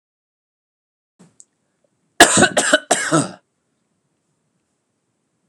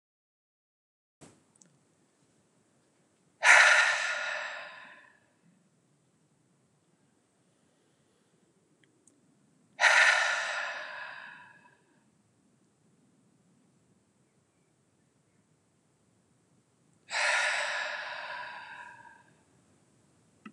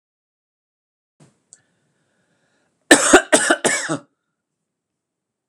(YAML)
cough_length: 5.5 s
cough_amplitude: 32768
cough_signal_mean_std_ratio: 0.27
exhalation_length: 20.5 s
exhalation_amplitude: 15090
exhalation_signal_mean_std_ratio: 0.29
three_cough_length: 5.5 s
three_cough_amplitude: 32768
three_cough_signal_mean_std_ratio: 0.26
survey_phase: alpha (2021-03-01 to 2021-08-12)
age: 45-64
gender: Male
wearing_mask: 'No'
symptom_none: true
smoker_status: Never smoked
respiratory_condition_asthma: false
respiratory_condition_other: false
recruitment_source: REACT
submission_delay: 3 days
covid_test_result: Negative
covid_test_method: RT-qPCR